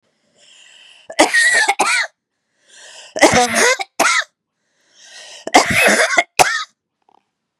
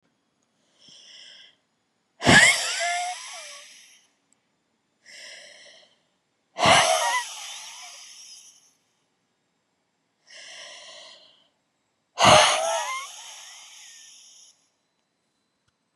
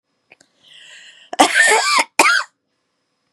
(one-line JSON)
{"three_cough_length": "7.6 s", "three_cough_amplitude": 32768, "three_cough_signal_mean_std_ratio": 0.48, "exhalation_length": "16.0 s", "exhalation_amplitude": 27507, "exhalation_signal_mean_std_ratio": 0.31, "cough_length": "3.3 s", "cough_amplitude": 32768, "cough_signal_mean_std_ratio": 0.43, "survey_phase": "beta (2021-08-13 to 2022-03-07)", "age": "18-44", "gender": "Female", "wearing_mask": "No", "symptom_shortness_of_breath": true, "symptom_fatigue": true, "symptom_fever_high_temperature": true, "symptom_headache": true, "smoker_status": "Ex-smoker", "respiratory_condition_asthma": true, "respiratory_condition_other": true, "recruitment_source": "Test and Trace", "submission_delay": "3 days", "covid_test_result": "Negative", "covid_test_method": "RT-qPCR"}